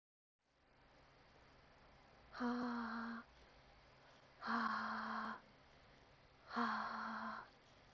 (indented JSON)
{
  "exhalation_length": "7.9 s",
  "exhalation_amplitude": 1586,
  "exhalation_signal_mean_std_ratio": 0.57,
  "survey_phase": "alpha (2021-03-01 to 2021-08-12)",
  "age": "18-44",
  "gender": "Female",
  "wearing_mask": "No",
  "symptom_cough_any": true,
  "symptom_new_continuous_cough": true,
  "symptom_fever_high_temperature": true,
  "symptom_headache": true,
  "symptom_change_to_sense_of_smell_or_taste": true,
  "symptom_loss_of_taste": true,
  "symptom_onset": "3 days",
  "smoker_status": "Never smoked",
  "respiratory_condition_asthma": false,
  "respiratory_condition_other": false,
  "recruitment_source": "Test and Trace",
  "submission_delay": "2 days",
  "covid_test_result": "Positive",
  "covid_test_method": "RT-qPCR",
  "covid_ct_value": 15.3,
  "covid_ct_gene": "N gene",
  "covid_ct_mean": 16.6,
  "covid_viral_load": "3500000 copies/ml",
  "covid_viral_load_category": "High viral load (>1M copies/ml)"
}